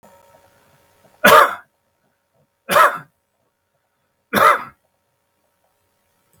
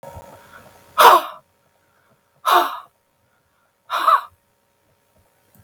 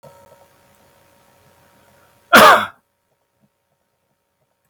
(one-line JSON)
{"three_cough_length": "6.4 s", "three_cough_amplitude": 32768, "three_cough_signal_mean_std_ratio": 0.28, "exhalation_length": "5.6 s", "exhalation_amplitude": 32768, "exhalation_signal_mean_std_ratio": 0.29, "cough_length": "4.7 s", "cough_amplitude": 32768, "cough_signal_mean_std_ratio": 0.22, "survey_phase": "beta (2021-08-13 to 2022-03-07)", "age": "45-64", "gender": "Male", "wearing_mask": "No", "symptom_none": true, "smoker_status": "Ex-smoker", "respiratory_condition_asthma": false, "respiratory_condition_other": false, "recruitment_source": "REACT", "submission_delay": "1 day", "covid_test_result": "Negative", "covid_test_method": "RT-qPCR"}